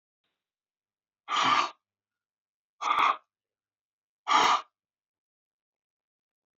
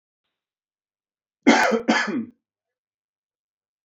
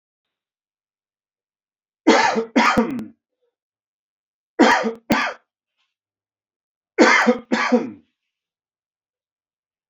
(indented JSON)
{
  "exhalation_length": "6.6 s",
  "exhalation_amplitude": 10675,
  "exhalation_signal_mean_std_ratio": 0.32,
  "cough_length": "3.8 s",
  "cough_amplitude": 27036,
  "cough_signal_mean_std_ratio": 0.32,
  "three_cough_length": "9.9 s",
  "three_cough_amplitude": 27980,
  "three_cough_signal_mean_std_ratio": 0.35,
  "survey_phase": "beta (2021-08-13 to 2022-03-07)",
  "age": "45-64",
  "gender": "Male",
  "wearing_mask": "No",
  "symptom_cough_any": true,
  "symptom_runny_or_blocked_nose": true,
  "symptom_fatigue": true,
  "symptom_fever_high_temperature": true,
  "symptom_change_to_sense_of_smell_or_taste": true,
  "symptom_onset": "6 days",
  "smoker_status": "Never smoked",
  "respiratory_condition_asthma": false,
  "respiratory_condition_other": false,
  "recruitment_source": "Test and Trace",
  "submission_delay": "2 days",
  "covid_test_result": "Positive",
  "covid_test_method": "RT-qPCR",
  "covid_ct_value": 15.3,
  "covid_ct_gene": "ORF1ab gene",
  "covid_ct_mean": 15.8,
  "covid_viral_load": "6800000 copies/ml",
  "covid_viral_load_category": "High viral load (>1M copies/ml)"
}